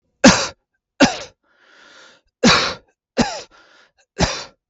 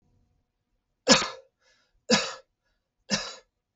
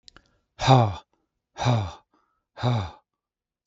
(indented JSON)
{
  "cough_length": "4.7 s",
  "cough_amplitude": 32768,
  "cough_signal_mean_std_ratio": 0.34,
  "three_cough_length": "3.8 s",
  "three_cough_amplitude": 24341,
  "three_cough_signal_mean_std_ratio": 0.27,
  "exhalation_length": "3.7 s",
  "exhalation_amplitude": 24346,
  "exhalation_signal_mean_std_ratio": 0.37,
  "survey_phase": "beta (2021-08-13 to 2022-03-07)",
  "age": "45-64",
  "gender": "Male",
  "wearing_mask": "No",
  "symptom_none": true,
  "smoker_status": "Never smoked",
  "respiratory_condition_asthma": false,
  "respiratory_condition_other": false,
  "recruitment_source": "REACT",
  "submission_delay": "2 days",
  "covid_test_result": "Negative",
  "covid_test_method": "RT-qPCR"
}